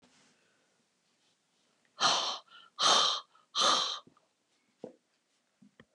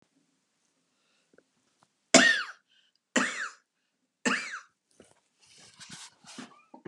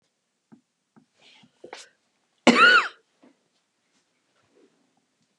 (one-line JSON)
{"exhalation_length": "5.9 s", "exhalation_amplitude": 8394, "exhalation_signal_mean_std_ratio": 0.36, "three_cough_length": "6.9 s", "three_cough_amplitude": 28579, "three_cough_signal_mean_std_ratio": 0.25, "cough_length": "5.4 s", "cough_amplitude": 24500, "cough_signal_mean_std_ratio": 0.22, "survey_phase": "beta (2021-08-13 to 2022-03-07)", "age": "65+", "gender": "Female", "wearing_mask": "No", "symptom_cough_any": true, "symptom_runny_or_blocked_nose": true, "symptom_sore_throat": true, "smoker_status": "Ex-smoker", "respiratory_condition_asthma": false, "respiratory_condition_other": false, "recruitment_source": "REACT", "submission_delay": "1 day", "covid_test_result": "Negative", "covid_test_method": "RT-qPCR", "influenza_a_test_result": "Negative", "influenza_b_test_result": "Negative"}